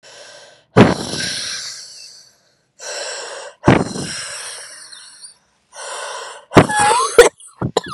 exhalation_length: 7.9 s
exhalation_amplitude: 32768
exhalation_signal_mean_std_ratio: 0.4
survey_phase: beta (2021-08-13 to 2022-03-07)
age: 18-44
gender: Female
wearing_mask: 'No'
symptom_cough_any: true
symptom_runny_or_blocked_nose: true
symptom_shortness_of_breath: true
symptom_sore_throat: true
symptom_diarrhoea: true
symptom_fatigue: true
symptom_headache: true
symptom_change_to_sense_of_smell_or_taste: true
symptom_loss_of_taste: true
symptom_onset: 3 days
smoker_status: Current smoker (1 to 10 cigarettes per day)
respiratory_condition_asthma: true
respiratory_condition_other: false
recruitment_source: Test and Trace
submission_delay: 1 day
covid_test_result: Positive
covid_test_method: RT-qPCR
covid_ct_value: 13.6
covid_ct_gene: ORF1ab gene
covid_ct_mean: 13.9
covid_viral_load: 27000000 copies/ml
covid_viral_load_category: High viral load (>1M copies/ml)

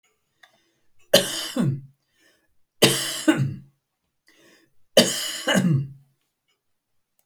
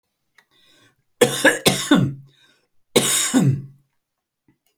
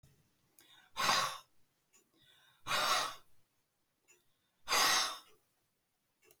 three_cough_length: 7.3 s
three_cough_amplitude: 32767
three_cough_signal_mean_std_ratio: 0.38
cough_length: 4.8 s
cough_amplitude: 30265
cough_signal_mean_std_ratio: 0.42
exhalation_length: 6.4 s
exhalation_amplitude: 3848
exhalation_signal_mean_std_ratio: 0.38
survey_phase: alpha (2021-03-01 to 2021-08-12)
age: 45-64
gender: Male
wearing_mask: 'No'
symptom_none: true
smoker_status: Never smoked
respiratory_condition_asthma: true
respiratory_condition_other: false
recruitment_source: REACT
submission_delay: 2 days
covid_test_result: Negative
covid_test_method: RT-qPCR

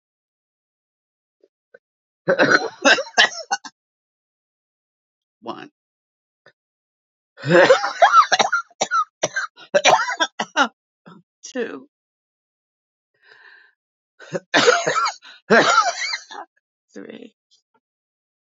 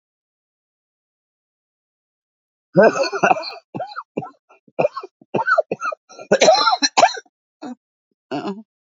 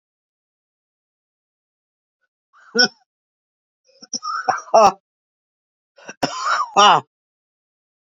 three_cough_length: 18.5 s
three_cough_amplitude: 32767
three_cough_signal_mean_std_ratio: 0.35
cough_length: 8.9 s
cough_amplitude: 32768
cough_signal_mean_std_ratio: 0.36
exhalation_length: 8.1 s
exhalation_amplitude: 32664
exhalation_signal_mean_std_ratio: 0.28
survey_phase: beta (2021-08-13 to 2022-03-07)
age: 65+
gender: Female
wearing_mask: 'No'
symptom_cough_any: true
symptom_runny_or_blocked_nose: true
symptom_shortness_of_breath: true
symptom_sore_throat: true
symptom_fatigue: true
symptom_fever_high_temperature: true
symptom_headache: true
symptom_other: true
smoker_status: Ex-smoker
respiratory_condition_asthma: true
respiratory_condition_other: true
recruitment_source: Test and Trace
submission_delay: 1 day
covid_test_result: Negative
covid_test_method: RT-qPCR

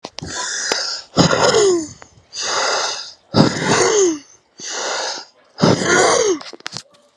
exhalation_length: 7.2 s
exhalation_amplitude: 32767
exhalation_signal_mean_std_ratio: 0.66
survey_phase: alpha (2021-03-01 to 2021-08-12)
age: 45-64
gender: Male
wearing_mask: 'No'
symptom_cough_any: true
symptom_shortness_of_breath: true
symptom_fatigue: true
symptom_headache: true
symptom_change_to_sense_of_smell_or_taste: true
symptom_loss_of_taste: true
symptom_onset: 4 days
smoker_status: Never smoked
respiratory_condition_asthma: false
respiratory_condition_other: true
recruitment_source: Test and Trace
submission_delay: 2 days
covid_test_result: Positive
covid_test_method: RT-qPCR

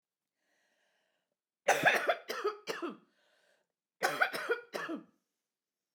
cough_length: 5.9 s
cough_amplitude: 6938
cough_signal_mean_std_ratio: 0.38
survey_phase: beta (2021-08-13 to 2022-03-07)
age: 45-64
gender: Female
wearing_mask: 'No'
symptom_cough_any: true
symptom_runny_or_blocked_nose: true
symptom_shortness_of_breath: true
symptom_onset: 9 days
smoker_status: Never smoked
respiratory_condition_asthma: true
respiratory_condition_other: false
recruitment_source: REACT
submission_delay: 1 day
covid_test_result: Negative
covid_test_method: RT-qPCR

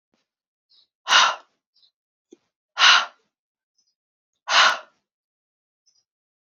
exhalation_length: 6.5 s
exhalation_amplitude: 29568
exhalation_signal_mean_std_ratio: 0.27
survey_phase: alpha (2021-03-01 to 2021-08-12)
age: 18-44
gender: Female
wearing_mask: 'No'
symptom_shortness_of_breath: true
symptom_fatigue: true
symptom_fever_high_temperature: true
symptom_headache: true
symptom_onset: 3 days
smoker_status: Never smoked
respiratory_condition_asthma: false
respiratory_condition_other: false
recruitment_source: Test and Trace
submission_delay: 1 day
covid_test_result: Positive
covid_test_method: RT-qPCR
covid_ct_value: 30.7
covid_ct_gene: N gene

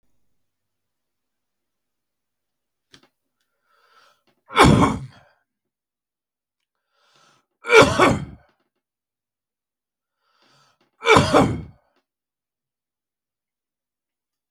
three_cough_length: 14.5 s
three_cough_amplitude: 32768
three_cough_signal_mean_std_ratio: 0.23
survey_phase: beta (2021-08-13 to 2022-03-07)
age: 45-64
gender: Male
wearing_mask: 'No'
symptom_none: true
smoker_status: Never smoked
respiratory_condition_asthma: false
respiratory_condition_other: false
recruitment_source: Test and Trace
submission_delay: 0 days
covid_test_result: Negative
covid_test_method: LFT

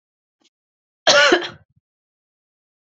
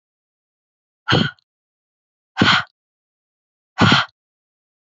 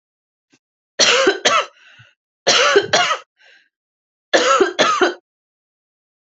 cough_length: 2.9 s
cough_amplitude: 29602
cough_signal_mean_std_ratio: 0.29
exhalation_length: 4.9 s
exhalation_amplitude: 27407
exhalation_signal_mean_std_ratio: 0.3
three_cough_length: 6.3 s
three_cough_amplitude: 32767
three_cough_signal_mean_std_ratio: 0.46
survey_phase: alpha (2021-03-01 to 2021-08-12)
age: 45-64
gender: Female
wearing_mask: 'No'
symptom_headache: true
symptom_loss_of_taste: true
smoker_status: Never smoked
respiratory_condition_asthma: false
respiratory_condition_other: false
recruitment_source: Test and Trace
submission_delay: 2 days
covid_test_result: Positive
covid_test_method: RT-qPCR
covid_ct_value: 22.1
covid_ct_gene: ORF1ab gene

